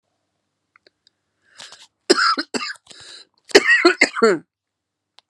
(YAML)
cough_length: 5.3 s
cough_amplitude: 32768
cough_signal_mean_std_ratio: 0.34
survey_phase: alpha (2021-03-01 to 2021-08-12)
age: 45-64
gender: Female
wearing_mask: 'No'
symptom_cough_any: true
symptom_new_continuous_cough: true
symptom_abdominal_pain: true
symptom_fatigue: true
symptom_headache: true
symptom_change_to_sense_of_smell_or_taste: true
symptom_loss_of_taste: true
symptom_onset: 3 days
smoker_status: Ex-smoker
respiratory_condition_asthma: false
respiratory_condition_other: false
recruitment_source: Test and Trace
submission_delay: 1 day
covid_test_result: Positive
covid_test_method: RT-qPCR
covid_ct_value: 18.7
covid_ct_gene: ORF1ab gene